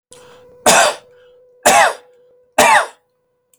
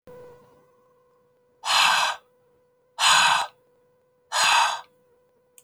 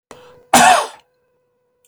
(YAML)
three_cough_length: 3.6 s
three_cough_amplitude: 32767
three_cough_signal_mean_std_ratio: 0.42
exhalation_length: 5.6 s
exhalation_amplitude: 19413
exhalation_signal_mean_std_ratio: 0.42
cough_length: 1.9 s
cough_amplitude: 32767
cough_signal_mean_std_ratio: 0.35
survey_phase: beta (2021-08-13 to 2022-03-07)
age: 65+
gender: Male
wearing_mask: 'No'
symptom_none: true
smoker_status: Never smoked
respiratory_condition_asthma: false
respiratory_condition_other: false
recruitment_source: REACT
submission_delay: 2 days
covid_test_result: Negative
covid_test_method: RT-qPCR